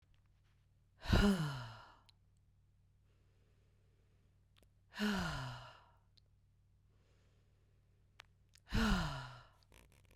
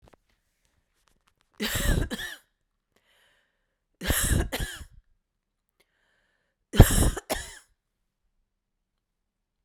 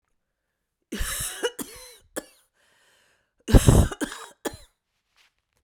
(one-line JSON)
{"exhalation_length": "10.2 s", "exhalation_amplitude": 3980, "exhalation_signal_mean_std_ratio": 0.34, "three_cough_length": "9.6 s", "three_cough_amplitude": 32768, "three_cough_signal_mean_std_ratio": 0.26, "cough_length": "5.6 s", "cough_amplitude": 27975, "cough_signal_mean_std_ratio": 0.27, "survey_phase": "beta (2021-08-13 to 2022-03-07)", "age": "45-64", "gender": "Female", "wearing_mask": "No", "symptom_none": true, "smoker_status": "Ex-smoker", "respiratory_condition_asthma": false, "respiratory_condition_other": false, "recruitment_source": "REACT", "submission_delay": "1 day", "covid_test_result": "Negative", "covid_test_method": "RT-qPCR", "influenza_a_test_result": "Negative", "influenza_b_test_result": "Negative"}